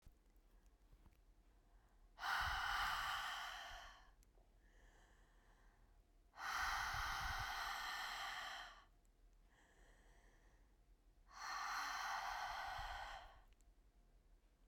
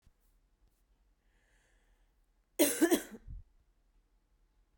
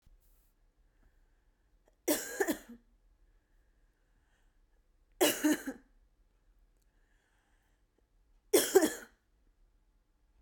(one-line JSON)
{"exhalation_length": "14.7 s", "exhalation_amplitude": 855, "exhalation_signal_mean_std_ratio": 0.62, "cough_length": "4.8 s", "cough_amplitude": 6759, "cough_signal_mean_std_ratio": 0.24, "three_cough_length": "10.4 s", "three_cough_amplitude": 9746, "three_cough_signal_mean_std_ratio": 0.25, "survey_phase": "beta (2021-08-13 to 2022-03-07)", "age": "18-44", "gender": "Female", "wearing_mask": "No", "symptom_cough_any": true, "symptom_sore_throat": true, "symptom_fatigue": true, "symptom_headache": true, "symptom_onset": "2 days", "smoker_status": "Never smoked", "respiratory_condition_asthma": true, "respiratory_condition_other": false, "recruitment_source": "Test and Trace", "submission_delay": "1 day", "covid_test_result": "Positive", "covid_test_method": "RT-qPCR", "covid_ct_value": 28.7, "covid_ct_gene": "N gene"}